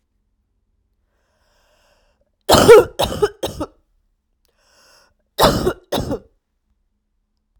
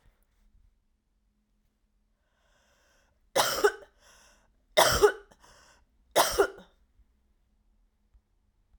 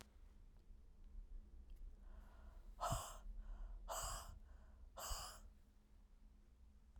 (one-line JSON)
{"cough_length": "7.6 s", "cough_amplitude": 32768, "cough_signal_mean_std_ratio": 0.27, "three_cough_length": "8.8 s", "three_cough_amplitude": 15604, "three_cough_signal_mean_std_ratio": 0.26, "exhalation_length": "7.0 s", "exhalation_amplitude": 979, "exhalation_signal_mean_std_ratio": 0.74, "survey_phase": "alpha (2021-03-01 to 2021-08-12)", "age": "18-44", "gender": "Female", "wearing_mask": "No", "symptom_cough_any": true, "symptom_new_continuous_cough": true, "symptom_shortness_of_breath": true, "symptom_fatigue": true, "symptom_fever_high_temperature": true, "symptom_headache": true, "symptom_change_to_sense_of_smell_or_taste": true, "symptom_loss_of_taste": true, "symptom_onset": "3 days", "smoker_status": "Ex-smoker", "respiratory_condition_asthma": false, "respiratory_condition_other": false, "recruitment_source": "Test and Trace", "submission_delay": "2 days", "covid_test_result": "Positive", "covid_test_method": "RT-qPCR", "covid_ct_value": 19.8, "covid_ct_gene": "ORF1ab gene"}